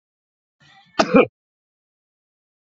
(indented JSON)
{
  "cough_length": "2.6 s",
  "cough_amplitude": 28013,
  "cough_signal_mean_std_ratio": 0.21,
  "survey_phase": "beta (2021-08-13 to 2022-03-07)",
  "age": "45-64",
  "gender": "Male",
  "wearing_mask": "No",
  "symptom_none": true,
  "smoker_status": "Current smoker (11 or more cigarettes per day)",
  "respiratory_condition_asthma": false,
  "respiratory_condition_other": false,
  "recruitment_source": "REACT",
  "submission_delay": "4 days",
  "covid_test_result": "Negative",
  "covid_test_method": "RT-qPCR"
}